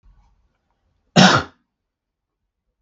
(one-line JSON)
{"cough_length": "2.8 s", "cough_amplitude": 32768, "cough_signal_mean_std_ratio": 0.24, "survey_phase": "beta (2021-08-13 to 2022-03-07)", "age": "45-64", "gender": "Male", "wearing_mask": "No", "symptom_sore_throat": true, "symptom_abdominal_pain": true, "symptom_fatigue": true, "symptom_onset": "12 days", "smoker_status": "Never smoked", "respiratory_condition_asthma": false, "respiratory_condition_other": false, "recruitment_source": "REACT", "submission_delay": "0 days", "covid_test_result": "Negative", "covid_test_method": "RT-qPCR"}